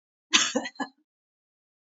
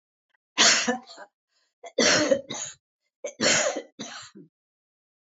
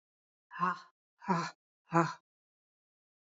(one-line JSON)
{"cough_length": "1.9 s", "cough_amplitude": 23477, "cough_signal_mean_std_ratio": 0.3, "three_cough_length": "5.4 s", "three_cough_amplitude": 17557, "three_cough_signal_mean_std_ratio": 0.41, "exhalation_length": "3.2 s", "exhalation_amplitude": 8463, "exhalation_signal_mean_std_ratio": 0.31, "survey_phase": "beta (2021-08-13 to 2022-03-07)", "age": "65+", "gender": "Female", "wearing_mask": "No", "symptom_cough_any": true, "symptom_change_to_sense_of_smell_or_taste": true, "smoker_status": "Never smoked", "respiratory_condition_asthma": false, "respiratory_condition_other": false, "recruitment_source": "REACT", "submission_delay": "1 day", "covid_test_result": "Negative", "covid_test_method": "RT-qPCR"}